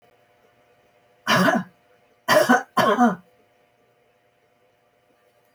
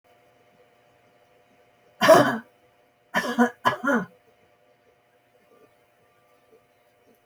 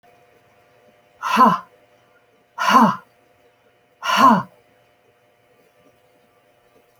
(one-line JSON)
{"three_cough_length": "5.5 s", "three_cough_amplitude": 21437, "three_cough_signal_mean_std_ratio": 0.35, "cough_length": "7.3 s", "cough_amplitude": 25348, "cough_signal_mean_std_ratio": 0.27, "exhalation_length": "7.0 s", "exhalation_amplitude": 27649, "exhalation_signal_mean_std_ratio": 0.31, "survey_phase": "alpha (2021-03-01 to 2021-08-12)", "age": "65+", "gender": "Female", "wearing_mask": "No", "symptom_none": true, "smoker_status": "Ex-smoker", "respiratory_condition_asthma": false, "respiratory_condition_other": false, "recruitment_source": "REACT", "submission_delay": "3 days", "covid_test_result": "Negative", "covid_test_method": "RT-qPCR"}